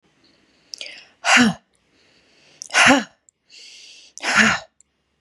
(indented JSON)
{
  "exhalation_length": "5.2 s",
  "exhalation_amplitude": 31480,
  "exhalation_signal_mean_std_ratio": 0.35,
  "survey_phase": "beta (2021-08-13 to 2022-03-07)",
  "age": "18-44",
  "gender": "Female",
  "wearing_mask": "No",
  "symptom_none": true,
  "smoker_status": "Current smoker (1 to 10 cigarettes per day)",
  "respiratory_condition_asthma": false,
  "respiratory_condition_other": false,
  "recruitment_source": "REACT",
  "submission_delay": "2 days",
  "covid_test_result": "Negative",
  "covid_test_method": "RT-qPCR",
  "influenza_a_test_result": "Negative",
  "influenza_b_test_result": "Negative"
}